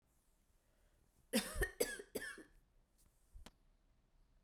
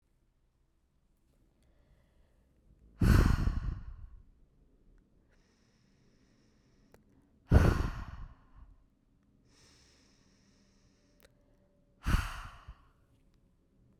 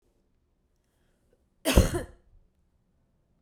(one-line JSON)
{"three_cough_length": "4.4 s", "three_cough_amplitude": 2555, "three_cough_signal_mean_std_ratio": 0.32, "exhalation_length": "14.0 s", "exhalation_amplitude": 11571, "exhalation_signal_mean_std_ratio": 0.26, "cough_length": "3.4 s", "cough_amplitude": 26463, "cough_signal_mean_std_ratio": 0.22, "survey_phase": "beta (2021-08-13 to 2022-03-07)", "age": "18-44", "gender": "Female", "wearing_mask": "No", "symptom_cough_any": true, "symptom_runny_or_blocked_nose": true, "symptom_sore_throat": true, "symptom_fatigue": true, "symptom_headache": true, "smoker_status": "Never smoked", "respiratory_condition_asthma": false, "respiratory_condition_other": false, "recruitment_source": "Test and Trace", "submission_delay": "2 days", "covid_test_result": "Positive", "covid_test_method": "LFT"}